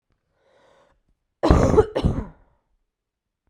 {
  "cough_length": "3.5 s",
  "cough_amplitude": 32768,
  "cough_signal_mean_std_ratio": 0.33,
  "survey_phase": "beta (2021-08-13 to 2022-03-07)",
  "age": "18-44",
  "gender": "Female",
  "wearing_mask": "No",
  "symptom_cough_any": true,
  "symptom_runny_or_blocked_nose": true,
  "symptom_fatigue": true,
  "symptom_fever_high_temperature": true,
  "symptom_headache": true,
  "symptom_onset": "3 days",
  "smoker_status": "Never smoked",
  "respiratory_condition_asthma": false,
  "respiratory_condition_other": false,
  "recruitment_source": "Test and Trace",
  "submission_delay": "2 days",
  "covid_test_result": "Positive",
  "covid_test_method": "RT-qPCR",
  "covid_ct_value": 20.7,
  "covid_ct_gene": "ORF1ab gene"
}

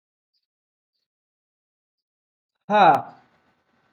{
  "exhalation_length": "3.9 s",
  "exhalation_amplitude": 22520,
  "exhalation_signal_mean_std_ratio": 0.23,
  "survey_phase": "alpha (2021-03-01 to 2021-08-12)",
  "age": "18-44",
  "gender": "Male",
  "wearing_mask": "No",
  "symptom_none": true,
  "smoker_status": "Prefer not to say",
  "respiratory_condition_asthma": false,
  "respiratory_condition_other": false,
  "recruitment_source": "REACT",
  "submission_delay": "6 days",
  "covid_test_result": "Negative",
  "covid_test_method": "RT-qPCR"
}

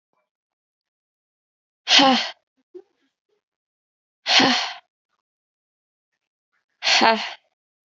{
  "exhalation_length": "7.9 s",
  "exhalation_amplitude": 29589,
  "exhalation_signal_mean_std_ratio": 0.3,
  "survey_phase": "beta (2021-08-13 to 2022-03-07)",
  "age": "18-44",
  "gender": "Female",
  "wearing_mask": "No",
  "symptom_cough_any": true,
  "symptom_runny_or_blocked_nose": true,
  "symptom_shortness_of_breath": true,
  "symptom_abdominal_pain": true,
  "symptom_diarrhoea": true,
  "symptom_fatigue": true,
  "symptom_headache": true,
  "symptom_change_to_sense_of_smell_or_taste": true,
  "symptom_loss_of_taste": true,
  "symptom_onset": "2 days",
  "smoker_status": "Ex-smoker",
  "respiratory_condition_asthma": false,
  "respiratory_condition_other": false,
  "recruitment_source": "Test and Trace",
  "submission_delay": "1 day",
  "covid_test_result": "Positive",
  "covid_test_method": "RT-qPCR",
  "covid_ct_value": 15.3,
  "covid_ct_gene": "ORF1ab gene",
  "covid_ct_mean": 15.4,
  "covid_viral_load": "8600000 copies/ml",
  "covid_viral_load_category": "High viral load (>1M copies/ml)"
}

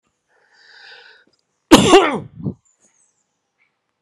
{
  "cough_length": "4.0 s",
  "cough_amplitude": 32768,
  "cough_signal_mean_std_ratio": 0.27,
  "survey_phase": "alpha (2021-03-01 to 2021-08-12)",
  "age": "45-64",
  "gender": "Male",
  "wearing_mask": "No",
  "symptom_cough_any": true,
  "symptom_fatigue": true,
  "symptom_headache": true,
  "symptom_change_to_sense_of_smell_or_taste": true,
  "symptom_loss_of_taste": true,
  "symptom_onset": "3 days",
  "smoker_status": "Ex-smoker",
  "respiratory_condition_asthma": false,
  "respiratory_condition_other": false,
  "recruitment_source": "Test and Trace",
  "submission_delay": "1 day",
  "covid_test_result": "Positive",
  "covid_test_method": "RT-qPCR"
}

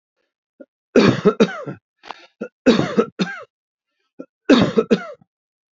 {
  "three_cough_length": "5.7 s",
  "three_cough_amplitude": 30293,
  "three_cough_signal_mean_std_ratio": 0.37,
  "survey_phase": "beta (2021-08-13 to 2022-03-07)",
  "age": "65+",
  "gender": "Male",
  "wearing_mask": "No",
  "symptom_none": true,
  "smoker_status": "Never smoked",
  "respiratory_condition_asthma": false,
  "respiratory_condition_other": false,
  "recruitment_source": "REACT",
  "submission_delay": "2 days",
  "covid_test_result": "Negative",
  "covid_test_method": "RT-qPCR",
  "influenza_a_test_result": "Negative",
  "influenza_b_test_result": "Negative"
}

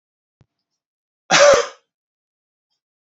{
  "cough_length": "3.1 s",
  "cough_amplitude": 32768,
  "cough_signal_mean_std_ratio": 0.27,
  "survey_phase": "beta (2021-08-13 to 2022-03-07)",
  "age": "18-44",
  "gender": "Male",
  "wearing_mask": "No",
  "symptom_none": true,
  "smoker_status": "Never smoked",
  "respiratory_condition_asthma": false,
  "respiratory_condition_other": false,
  "recruitment_source": "Test and Trace",
  "submission_delay": "0 days",
  "covid_test_result": "Negative",
  "covid_test_method": "LFT"
}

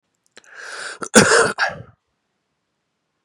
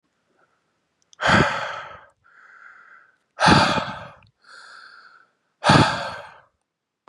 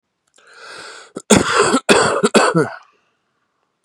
{
  "cough_length": "3.2 s",
  "cough_amplitude": 32768,
  "cough_signal_mean_std_ratio": 0.33,
  "exhalation_length": "7.1 s",
  "exhalation_amplitude": 28269,
  "exhalation_signal_mean_std_ratio": 0.36,
  "three_cough_length": "3.8 s",
  "three_cough_amplitude": 32768,
  "three_cough_signal_mean_std_ratio": 0.47,
  "survey_phase": "beta (2021-08-13 to 2022-03-07)",
  "age": "18-44",
  "gender": "Male",
  "wearing_mask": "No",
  "symptom_none": true,
  "smoker_status": "Current smoker (11 or more cigarettes per day)",
  "respiratory_condition_asthma": false,
  "respiratory_condition_other": false,
  "recruitment_source": "REACT",
  "submission_delay": "3 days",
  "covid_test_result": "Negative",
  "covid_test_method": "RT-qPCR",
  "influenza_a_test_result": "Negative",
  "influenza_b_test_result": "Negative"
}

